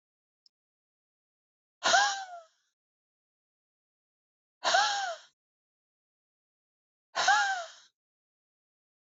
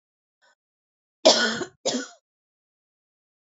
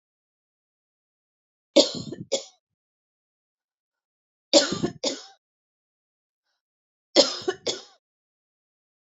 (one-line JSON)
{"exhalation_length": "9.1 s", "exhalation_amplitude": 9404, "exhalation_signal_mean_std_ratio": 0.3, "cough_length": "3.5 s", "cough_amplitude": 24702, "cough_signal_mean_std_ratio": 0.27, "three_cough_length": "9.1 s", "three_cough_amplitude": 26438, "three_cough_signal_mean_std_ratio": 0.23, "survey_phase": "beta (2021-08-13 to 2022-03-07)", "age": "45-64", "gender": "Female", "wearing_mask": "No", "symptom_none": true, "smoker_status": "Never smoked", "respiratory_condition_asthma": false, "respiratory_condition_other": false, "recruitment_source": "REACT", "submission_delay": "2 days", "covid_test_result": "Negative", "covid_test_method": "RT-qPCR", "influenza_a_test_result": "Negative", "influenza_b_test_result": "Negative"}